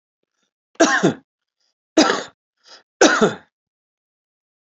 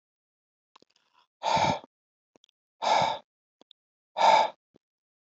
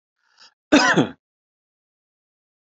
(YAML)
three_cough_length: 4.8 s
three_cough_amplitude: 29567
three_cough_signal_mean_std_ratio: 0.32
exhalation_length: 5.4 s
exhalation_amplitude: 12877
exhalation_signal_mean_std_ratio: 0.33
cough_length: 2.6 s
cough_amplitude: 27442
cough_signal_mean_std_ratio: 0.28
survey_phase: alpha (2021-03-01 to 2021-08-12)
age: 45-64
gender: Male
wearing_mask: 'No'
symptom_none: true
symptom_onset: 4 days
smoker_status: Never smoked
respiratory_condition_asthma: false
respiratory_condition_other: false
recruitment_source: REACT
submission_delay: 2 days
covid_test_result: Negative
covid_test_method: RT-qPCR